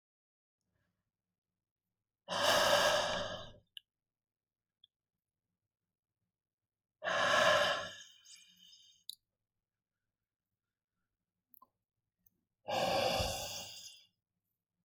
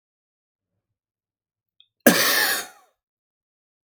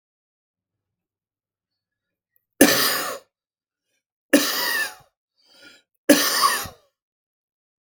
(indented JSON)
{
  "exhalation_length": "14.8 s",
  "exhalation_amplitude": 5601,
  "exhalation_signal_mean_std_ratio": 0.35,
  "cough_length": "3.8 s",
  "cough_amplitude": 31956,
  "cough_signal_mean_std_ratio": 0.28,
  "three_cough_length": "7.9 s",
  "three_cough_amplitude": 32768,
  "three_cough_signal_mean_std_ratio": 0.32,
  "survey_phase": "beta (2021-08-13 to 2022-03-07)",
  "age": "18-44",
  "gender": "Male",
  "wearing_mask": "No",
  "symptom_none": true,
  "symptom_onset": "10 days",
  "smoker_status": "Ex-smoker",
  "respiratory_condition_asthma": false,
  "respiratory_condition_other": false,
  "recruitment_source": "REACT",
  "submission_delay": "1 day",
  "covid_test_result": "Negative",
  "covid_test_method": "RT-qPCR",
  "influenza_a_test_result": "Negative",
  "influenza_b_test_result": "Negative"
}